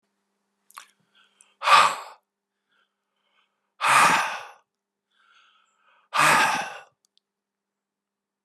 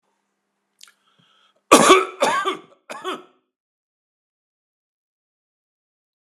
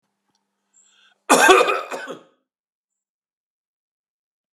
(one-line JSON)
{"exhalation_length": "8.4 s", "exhalation_amplitude": 23122, "exhalation_signal_mean_std_ratio": 0.32, "three_cough_length": "6.3 s", "three_cough_amplitude": 32768, "three_cough_signal_mean_std_ratio": 0.24, "cough_length": "4.5 s", "cough_amplitude": 32767, "cough_signal_mean_std_ratio": 0.27, "survey_phase": "beta (2021-08-13 to 2022-03-07)", "age": "65+", "gender": "Male", "wearing_mask": "No", "symptom_none": true, "smoker_status": "Never smoked", "respiratory_condition_asthma": false, "respiratory_condition_other": false, "recruitment_source": "REACT", "submission_delay": "2 days", "covid_test_result": "Negative", "covid_test_method": "RT-qPCR"}